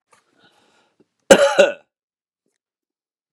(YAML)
cough_length: 3.3 s
cough_amplitude: 32768
cough_signal_mean_std_ratio: 0.24
survey_phase: beta (2021-08-13 to 2022-03-07)
age: 45-64
gender: Male
wearing_mask: 'No'
symptom_abdominal_pain: true
smoker_status: Ex-smoker
respiratory_condition_asthma: false
respiratory_condition_other: false
recruitment_source: REACT
submission_delay: 2 days
covid_test_result: Negative
covid_test_method: RT-qPCR
influenza_a_test_result: Negative
influenza_b_test_result: Negative